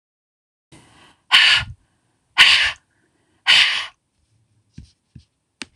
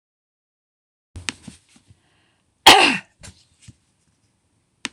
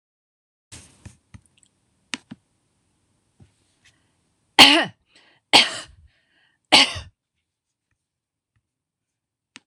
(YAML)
exhalation_length: 5.8 s
exhalation_amplitude: 26028
exhalation_signal_mean_std_ratio: 0.33
cough_length: 4.9 s
cough_amplitude: 26028
cough_signal_mean_std_ratio: 0.2
three_cough_length: 9.7 s
three_cough_amplitude: 26028
three_cough_signal_mean_std_ratio: 0.19
survey_phase: beta (2021-08-13 to 2022-03-07)
age: 65+
gender: Female
wearing_mask: 'No'
symptom_none: true
smoker_status: Never smoked
respiratory_condition_asthma: false
respiratory_condition_other: false
recruitment_source: REACT
submission_delay: 1 day
covid_test_result: Negative
covid_test_method: RT-qPCR